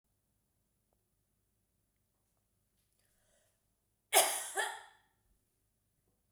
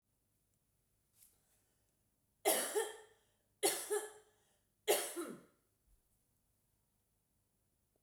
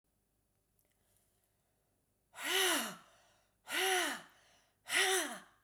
cough_length: 6.3 s
cough_amplitude: 9569
cough_signal_mean_std_ratio: 0.2
three_cough_length: 8.0 s
three_cough_amplitude: 3724
three_cough_signal_mean_std_ratio: 0.3
exhalation_length: 5.6 s
exhalation_amplitude: 4178
exhalation_signal_mean_std_ratio: 0.42
survey_phase: beta (2021-08-13 to 2022-03-07)
age: 45-64
gender: Female
wearing_mask: 'No'
symptom_runny_or_blocked_nose: true
symptom_fatigue: true
symptom_onset: 12 days
smoker_status: Never smoked
respiratory_condition_asthma: false
respiratory_condition_other: false
recruitment_source: REACT
submission_delay: 1 day
covid_test_result: Negative
covid_test_method: RT-qPCR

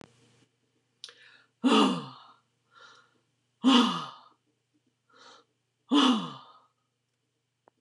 exhalation_length: 7.8 s
exhalation_amplitude: 11093
exhalation_signal_mean_std_ratio: 0.31
survey_phase: beta (2021-08-13 to 2022-03-07)
age: 65+
gender: Female
wearing_mask: 'No'
symptom_change_to_sense_of_smell_or_taste: true
symptom_onset: 12 days
smoker_status: Never smoked
respiratory_condition_asthma: false
respiratory_condition_other: false
recruitment_source: REACT
submission_delay: 2 days
covid_test_result: Negative
covid_test_method: RT-qPCR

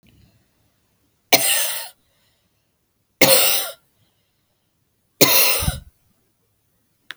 three_cough_length: 7.2 s
three_cough_amplitude: 32768
three_cough_signal_mean_std_ratio: 0.34
survey_phase: beta (2021-08-13 to 2022-03-07)
age: 45-64
gender: Female
wearing_mask: 'No'
symptom_cough_any: true
symptom_runny_or_blocked_nose: true
symptom_sore_throat: true
symptom_other: true
symptom_onset: 4 days
smoker_status: Never smoked
respiratory_condition_asthma: false
respiratory_condition_other: false
recruitment_source: Test and Trace
submission_delay: 1 day
covid_test_result: Positive
covid_test_method: RT-qPCR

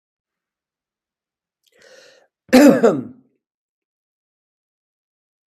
cough_length: 5.5 s
cough_amplitude: 32766
cough_signal_mean_std_ratio: 0.23
survey_phase: beta (2021-08-13 to 2022-03-07)
age: 65+
gender: Male
wearing_mask: 'No'
symptom_none: true
smoker_status: Ex-smoker
respiratory_condition_asthma: false
respiratory_condition_other: false
recruitment_source: REACT
submission_delay: 1 day
covid_test_result: Negative
covid_test_method: RT-qPCR
influenza_a_test_result: Negative
influenza_b_test_result: Negative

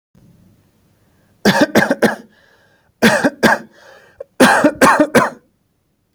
cough_length: 6.1 s
cough_amplitude: 32768
cough_signal_mean_std_ratio: 0.43
survey_phase: alpha (2021-03-01 to 2021-08-12)
age: 18-44
gender: Male
wearing_mask: 'No'
symptom_none: true
smoker_status: Never smoked
respiratory_condition_asthma: false
respiratory_condition_other: false
recruitment_source: REACT
submission_delay: 1 day
covid_test_result: Negative
covid_test_method: RT-qPCR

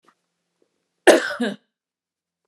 cough_length: 2.5 s
cough_amplitude: 29204
cough_signal_mean_std_ratio: 0.25
survey_phase: alpha (2021-03-01 to 2021-08-12)
age: 45-64
gender: Female
wearing_mask: 'No'
symptom_shortness_of_breath: true
symptom_fatigue: true
symptom_onset: 13 days
smoker_status: Ex-smoker
respiratory_condition_asthma: false
respiratory_condition_other: true
recruitment_source: REACT
submission_delay: 2 days
covid_test_result: Negative
covid_test_method: RT-qPCR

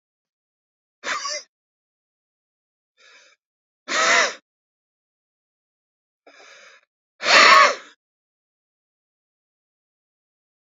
exhalation_length: 10.8 s
exhalation_amplitude: 32082
exhalation_signal_mean_std_ratio: 0.24
survey_phase: beta (2021-08-13 to 2022-03-07)
age: 65+
gender: Male
wearing_mask: 'No'
symptom_none: true
smoker_status: Ex-smoker
respiratory_condition_asthma: false
respiratory_condition_other: false
recruitment_source: REACT
submission_delay: 7 days
covid_test_result: Negative
covid_test_method: RT-qPCR
influenza_a_test_result: Negative
influenza_b_test_result: Negative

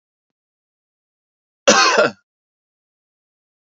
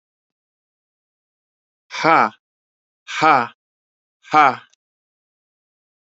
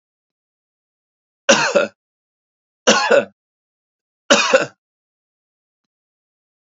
cough_length: 3.8 s
cough_amplitude: 30784
cough_signal_mean_std_ratio: 0.26
exhalation_length: 6.1 s
exhalation_amplitude: 29142
exhalation_signal_mean_std_ratio: 0.26
three_cough_length: 6.7 s
three_cough_amplitude: 31673
three_cough_signal_mean_std_ratio: 0.3
survey_phase: alpha (2021-03-01 to 2021-08-12)
age: 65+
gender: Male
wearing_mask: 'No'
symptom_none: true
smoker_status: Never smoked
respiratory_condition_asthma: false
respiratory_condition_other: false
recruitment_source: REACT
submission_delay: 6 days
covid_test_result: Negative
covid_test_method: RT-qPCR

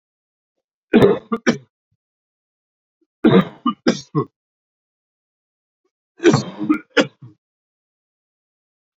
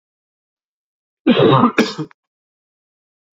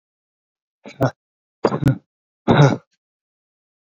three_cough_length: 9.0 s
three_cough_amplitude: 32768
three_cough_signal_mean_std_ratio: 0.29
cough_length: 3.3 s
cough_amplitude: 28688
cough_signal_mean_std_ratio: 0.35
exhalation_length: 3.9 s
exhalation_amplitude: 29294
exhalation_signal_mean_std_ratio: 0.3
survey_phase: beta (2021-08-13 to 2022-03-07)
age: 18-44
gender: Male
wearing_mask: 'No'
symptom_cough_any: true
symptom_runny_or_blocked_nose: true
symptom_shortness_of_breath: true
symptom_sore_throat: true
symptom_fatigue: true
symptom_headache: true
symptom_other: true
symptom_onset: 3 days
smoker_status: Never smoked
respiratory_condition_asthma: false
respiratory_condition_other: false
recruitment_source: Test and Trace
submission_delay: 2 days
covid_test_result: Positive
covid_test_method: LAMP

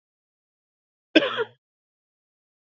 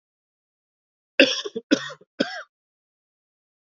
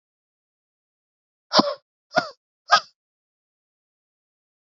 cough_length: 2.7 s
cough_amplitude: 28562
cough_signal_mean_std_ratio: 0.19
three_cough_length: 3.7 s
three_cough_amplitude: 32768
three_cough_signal_mean_std_ratio: 0.24
exhalation_length: 4.8 s
exhalation_amplitude: 27667
exhalation_signal_mean_std_ratio: 0.19
survey_phase: beta (2021-08-13 to 2022-03-07)
age: 18-44
gender: Male
wearing_mask: 'No'
symptom_cough_any: true
symptom_new_continuous_cough: true
symptom_runny_or_blocked_nose: true
symptom_fatigue: true
symptom_headache: true
symptom_change_to_sense_of_smell_or_taste: true
symptom_loss_of_taste: true
symptom_onset: 6 days
smoker_status: Current smoker (e-cigarettes or vapes only)
respiratory_condition_asthma: false
respiratory_condition_other: false
recruitment_source: Test and Trace
submission_delay: 3 days
covid_test_result: Positive
covid_test_method: RT-qPCR
covid_ct_value: 23.0
covid_ct_gene: ORF1ab gene
covid_ct_mean: 23.6
covid_viral_load: 19000 copies/ml
covid_viral_load_category: Low viral load (10K-1M copies/ml)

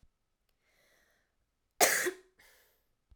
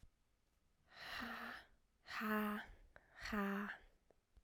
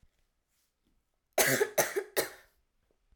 cough_length: 3.2 s
cough_amplitude: 14879
cough_signal_mean_std_ratio: 0.24
exhalation_length: 4.4 s
exhalation_amplitude: 1301
exhalation_signal_mean_std_ratio: 0.53
three_cough_length: 3.2 s
three_cough_amplitude: 11038
three_cough_signal_mean_std_ratio: 0.34
survey_phase: alpha (2021-03-01 to 2021-08-12)
age: 18-44
gender: Female
wearing_mask: 'No'
symptom_new_continuous_cough: true
symptom_abdominal_pain: true
symptom_diarrhoea: true
symptom_headache: true
symptom_loss_of_taste: true
smoker_status: Never smoked
respiratory_condition_asthma: false
respiratory_condition_other: false
recruitment_source: Test and Trace
submission_delay: 2 days
covid_test_result: Positive
covid_test_method: LFT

